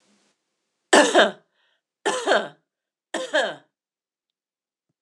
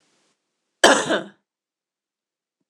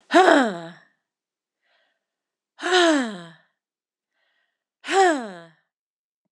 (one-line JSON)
{"three_cough_length": "5.0 s", "three_cough_amplitude": 26028, "three_cough_signal_mean_std_ratio": 0.32, "cough_length": "2.7 s", "cough_amplitude": 26028, "cough_signal_mean_std_ratio": 0.25, "exhalation_length": "6.3 s", "exhalation_amplitude": 25948, "exhalation_signal_mean_std_ratio": 0.34, "survey_phase": "beta (2021-08-13 to 2022-03-07)", "age": "45-64", "gender": "Female", "wearing_mask": "No", "symptom_cough_any": true, "symptom_runny_or_blocked_nose": true, "symptom_sore_throat": true, "symptom_fatigue": true, "symptom_headache": true, "symptom_onset": "2 days", "smoker_status": "Never smoked", "respiratory_condition_asthma": false, "respiratory_condition_other": false, "recruitment_source": "Test and Trace", "submission_delay": "2 days", "covid_test_result": "Positive", "covid_test_method": "RT-qPCR", "covid_ct_value": 15.9, "covid_ct_gene": "ORF1ab gene", "covid_ct_mean": 16.2, "covid_viral_load": "4800000 copies/ml", "covid_viral_load_category": "High viral load (>1M copies/ml)"}